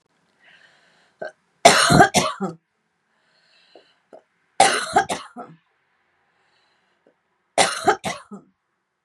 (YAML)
three_cough_length: 9.0 s
three_cough_amplitude: 32768
three_cough_signal_mean_std_ratio: 0.3
survey_phase: beta (2021-08-13 to 2022-03-07)
age: 45-64
gender: Female
wearing_mask: 'No'
symptom_none: true
smoker_status: Ex-smoker
respiratory_condition_asthma: false
respiratory_condition_other: false
recruitment_source: REACT
submission_delay: 1 day
covid_test_result: Negative
covid_test_method: RT-qPCR
influenza_a_test_result: Negative
influenza_b_test_result: Negative